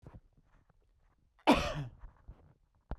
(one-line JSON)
{"cough_length": "3.0 s", "cough_amplitude": 7764, "cough_signal_mean_std_ratio": 0.28, "survey_phase": "beta (2021-08-13 to 2022-03-07)", "age": "45-64", "gender": "Male", "wearing_mask": "No", "symptom_cough_any": true, "symptom_sore_throat": true, "symptom_onset": "2 days", "smoker_status": "Never smoked", "respiratory_condition_asthma": false, "respiratory_condition_other": false, "recruitment_source": "REACT", "submission_delay": "3 days", "covid_test_result": "Negative", "covid_test_method": "RT-qPCR", "influenza_a_test_result": "Negative", "influenza_b_test_result": "Negative"}